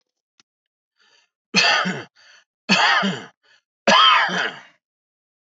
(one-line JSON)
{"three_cough_length": "5.5 s", "three_cough_amplitude": 26425, "three_cough_signal_mean_std_ratio": 0.43, "survey_phase": "beta (2021-08-13 to 2022-03-07)", "age": "65+", "gender": "Male", "wearing_mask": "No", "symptom_cough_any": true, "symptom_runny_or_blocked_nose": true, "symptom_headache": true, "smoker_status": "Ex-smoker", "respiratory_condition_asthma": false, "respiratory_condition_other": false, "recruitment_source": "REACT", "submission_delay": "1 day", "covid_test_result": "Negative", "covid_test_method": "RT-qPCR"}